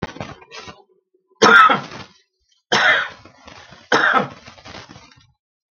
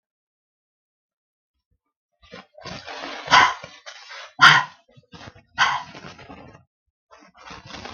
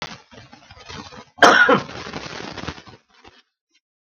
{
  "three_cough_length": "5.7 s",
  "three_cough_amplitude": 32768,
  "three_cough_signal_mean_std_ratio": 0.38,
  "exhalation_length": "7.9 s",
  "exhalation_amplitude": 32768,
  "exhalation_signal_mean_std_ratio": 0.26,
  "cough_length": "4.0 s",
  "cough_amplitude": 32768,
  "cough_signal_mean_std_ratio": 0.32,
  "survey_phase": "beta (2021-08-13 to 2022-03-07)",
  "age": "65+",
  "gender": "Male",
  "wearing_mask": "No",
  "symptom_none": true,
  "smoker_status": "Current smoker (e-cigarettes or vapes only)",
  "respiratory_condition_asthma": false,
  "respiratory_condition_other": false,
  "recruitment_source": "REACT",
  "submission_delay": "5 days",
  "covid_test_result": "Negative",
  "covid_test_method": "RT-qPCR",
  "influenza_a_test_result": "Negative",
  "influenza_b_test_result": "Negative"
}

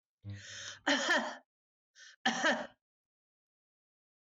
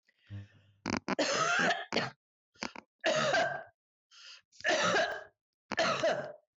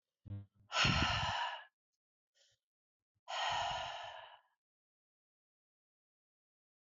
{
  "cough_length": "4.4 s",
  "cough_amplitude": 3744,
  "cough_signal_mean_std_ratio": 0.4,
  "three_cough_length": "6.6 s",
  "three_cough_amplitude": 5749,
  "three_cough_signal_mean_std_ratio": 0.59,
  "exhalation_length": "6.9 s",
  "exhalation_amplitude": 3589,
  "exhalation_signal_mean_std_ratio": 0.4,
  "survey_phase": "beta (2021-08-13 to 2022-03-07)",
  "age": "45-64",
  "gender": "Female",
  "wearing_mask": "No",
  "symptom_runny_or_blocked_nose": true,
  "symptom_onset": "3 days",
  "smoker_status": "Never smoked",
  "respiratory_condition_asthma": false,
  "respiratory_condition_other": false,
  "recruitment_source": "Test and Trace",
  "submission_delay": "1 day",
  "covid_test_result": "Positive",
  "covid_test_method": "RT-qPCR",
  "covid_ct_value": 17.4,
  "covid_ct_gene": "ORF1ab gene",
  "covid_ct_mean": 18.5,
  "covid_viral_load": "850000 copies/ml",
  "covid_viral_load_category": "Low viral load (10K-1M copies/ml)"
}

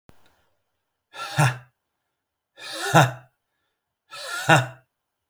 {
  "exhalation_length": "5.3 s",
  "exhalation_amplitude": 27313,
  "exhalation_signal_mean_std_ratio": 0.31,
  "survey_phase": "alpha (2021-03-01 to 2021-08-12)",
  "age": "18-44",
  "gender": "Male",
  "wearing_mask": "No",
  "symptom_fatigue": true,
  "smoker_status": "Current smoker (e-cigarettes or vapes only)",
  "respiratory_condition_asthma": false,
  "respiratory_condition_other": false,
  "recruitment_source": "Test and Trace",
  "submission_delay": "1 day",
  "covid_test_result": "Positive",
  "covid_test_method": "RT-qPCR",
  "covid_ct_value": 23.3,
  "covid_ct_gene": "ORF1ab gene",
  "covid_ct_mean": 23.9,
  "covid_viral_load": "15000 copies/ml",
  "covid_viral_load_category": "Low viral load (10K-1M copies/ml)"
}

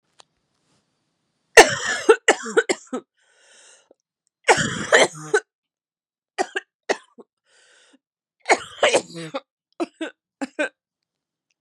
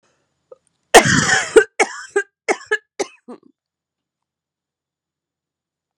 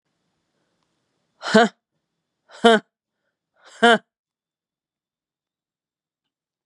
{
  "three_cough_length": "11.6 s",
  "three_cough_amplitude": 32768,
  "three_cough_signal_mean_std_ratio": 0.28,
  "cough_length": "6.0 s",
  "cough_amplitude": 32768,
  "cough_signal_mean_std_ratio": 0.27,
  "exhalation_length": "6.7 s",
  "exhalation_amplitude": 32767,
  "exhalation_signal_mean_std_ratio": 0.2,
  "survey_phase": "beta (2021-08-13 to 2022-03-07)",
  "age": "45-64",
  "gender": "Female",
  "wearing_mask": "No",
  "symptom_cough_any": true,
  "symptom_runny_or_blocked_nose": true,
  "symptom_sore_throat": true,
  "symptom_fatigue": true,
  "symptom_fever_high_temperature": true,
  "symptom_headache": true,
  "symptom_change_to_sense_of_smell_or_taste": true,
  "symptom_loss_of_taste": true,
  "smoker_status": "Ex-smoker",
  "respiratory_condition_asthma": false,
  "respiratory_condition_other": false,
  "recruitment_source": "Test and Trace",
  "submission_delay": "1 day",
  "covid_test_result": "Positive",
  "covid_test_method": "LFT"
}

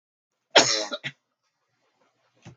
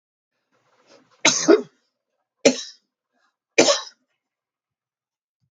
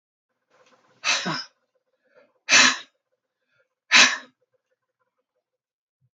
{
  "cough_length": "2.6 s",
  "cough_amplitude": 26830,
  "cough_signal_mean_std_ratio": 0.25,
  "three_cough_length": "5.5 s",
  "three_cough_amplitude": 29408,
  "three_cough_signal_mean_std_ratio": 0.25,
  "exhalation_length": "6.1 s",
  "exhalation_amplitude": 27568,
  "exhalation_signal_mean_std_ratio": 0.26,
  "survey_phase": "alpha (2021-03-01 to 2021-08-12)",
  "age": "65+",
  "gender": "Female",
  "wearing_mask": "No",
  "symptom_none": true,
  "smoker_status": "Ex-smoker",
  "respiratory_condition_asthma": false,
  "respiratory_condition_other": false,
  "recruitment_source": "REACT",
  "submission_delay": "3 days",
  "covid_test_result": "Negative",
  "covid_test_method": "RT-qPCR"
}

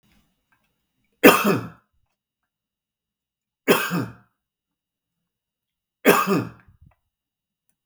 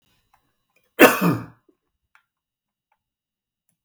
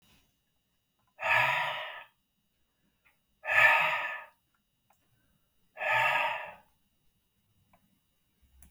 {
  "three_cough_length": "7.9 s",
  "three_cough_amplitude": 32768,
  "three_cough_signal_mean_std_ratio": 0.26,
  "cough_length": "3.8 s",
  "cough_amplitude": 32768,
  "cough_signal_mean_std_ratio": 0.21,
  "exhalation_length": "8.7 s",
  "exhalation_amplitude": 10077,
  "exhalation_signal_mean_std_ratio": 0.37,
  "survey_phase": "beta (2021-08-13 to 2022-03-07)",
  "age": "45-64",
  "gender": "Male",
  "wearing_mask": "No",
  "symptom_none": true,
  "smoker_status": "Ex-smoker",
  "respiratory_condition_asthma": false,
  "respiratory_condition_other": false,
  "recruitment_source": "REACT",
  "submission_delay": "0 days",
  "covid_test_result": "Negative",
  "covid_test_method": "RT-qPCR"
}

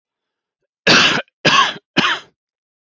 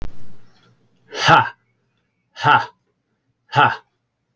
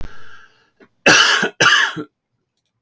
{
  "three_cough_length": "2.8 s",
  "three_cough_amplitude": 32324,
  "three_cough_signal_mean_std_ratio": 0.44,
  "exhalation_length": "4.4 s",
  "exhalation_amplitude": 30380,
  "exhalation_signal_mean_std_ratio": 0.38,
  "cough_length": "2.8 s",
  "cough_amplitude": 32767,
  "cough_signal_mean_std_ratio": 0.48,
  "survey_phase": "alpha (2021-03-01 to 2021-08-12)",
  "age": "45-64",
  "gender": "Male",
  "wearing_mask": "No",
  "symptom_none": true,
  "smoker_status": "Never smoked",
  "respiratory_condition_asthma": false,
  "respiratory_condition_other": false,
  "recruitment_source": "REACT",
  "submission_delay": "6 days",
  "covid_test_result": "Negative",
  "covid_test_method": "RT-qPCR"
}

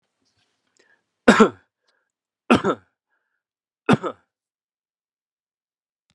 {
  "three_cough_length": "6.1 s",
  "three_cough_amplitude": 32767,
  "three_cough_signal_mean_std_ratio": 0.2,
  "survey_phase": "beta (2021-08-13 to 2022-03-07)",
  "age": "45-64",
  "gender": "Male",
  "wearing_mask": "No",
  "symptom_cough_any": true,
  "symptom_runny_or_blocked_nose": true,
  "symptom_sore_throat": true,
  "symptom_change_to_sense_of_smell_or_taste": true,
  "symptom_loss_of_taste": true,
  "symptom_onset": "5 days",
  "smoker_status": "Ex-smoker",
  "respiratory_condition_asthma": false,
  "respiratory_condition_other": false,
  "recruitment_source": "Test and Trace",
  "submission_delay": "2 days",
  "covid_test_result": "Positive",
  "covid_test_method": "ePCR"
}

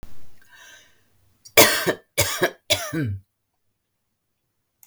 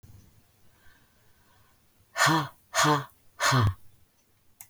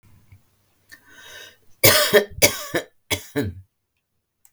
{
  "cough_length": "4.9 s",
  "cough_amplitude": 32768,
  "cough_signal_mean_std_ratio": 0.36,
  "exhalation_length": "4.7 s",
  "exhalation_amplitude": 11427,
  "exhalation_signal_mean_std_ratio": 0.39,
  "three_cough_length": "4.5 s",
  "three_cough_amplitude": 32768,
  "three_cough_signal_mean_std_ratio": 0.33,
  "survey_phase": "beta (2021-08-13 to 2022-03-07)",
  "age": "65+",
  "gender": "Female",
  "wearing_mask": "No",
  "symptom_none": true,
  "smoker_status": "Never smoked",
  "respiratory_condition_asthma": false,
  "respiratory_condition_other": false,
  "recruitment_source": "REACT",
  "submission_delay": "1 day",
  "covid_test_result": "Negative",
  "covid_test_method": "RT-qPCR",
  "influenza_a_test_result": "Negative",
  "influenza_b_test_result": "Negative"
}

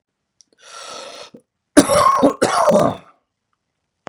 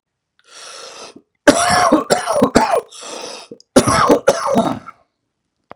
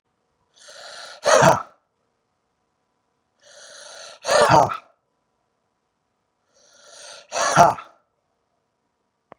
{
  "three_cough_length": "4.1 s",
  "three_cough_amplitude": 32768,
  "three_cough_signal_mean_std_ratio": 0.42,
  "cough_length": "5.8 s",
  "cough_amplitude": 32768,
  "cough_signal_mean_std_ratio": 0.49,
  "exhalation_length": "9.4 s",
  "exhalation_amplitude": 32767,
  "exhalation_signal_mean_std_ratio": 0.28,
  "survey_phase": "beta (2021-08-13 to 2022-03-07)",
  "age": "45-64",
  "gender": "Male",
  "wearing_mask": "No",
  "symptom_cough_any": true,
  "symptom_runny_or_blocked_nose": true,
  "symptom_shortness_of_breath": true,
  "symptom_fatigue": true,
  "symptom_headache": true,
  "smoker_status": "Never smoked",
  "respiratory_condition_asthma": false,
  "respiratory_condition_other": false,
  "recruitment_source": "Test and Trace",
  "submission_delay": "1 day",
  "covid_test_result": "Positive",
  "covid_test_method": "LFT"
}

